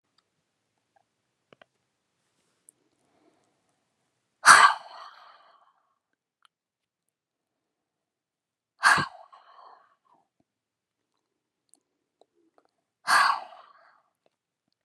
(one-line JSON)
{"exhalation_length": "14.8 s", "exhalation_amplitude": 29002, "exhalation_signal_mean_std_ratio": 0.18, "survey_phase": "beta (2021-08-13 to 2022-03-07)", "age": "18-44", "gender": "Female", "wearing_mask": "No", "symptom_cough_any": true, "symptom_runny_or_blocked_nose": true, "symptom_sore_throat": true, "symptom_other": true, "symptom_onset": "3 days", "smoker_status": "Ex-smoker", "respiratory_condition_asthma": false, "respiratory_condition_other": false, "recruitment_source": "Test and Trace", "submission_delay": "2 days", "covid_test_result": "Positive", "covid_test_method": "RT-qPCR", "covid_ct_value": 23.2, "covid_ct_gene": "N gene"}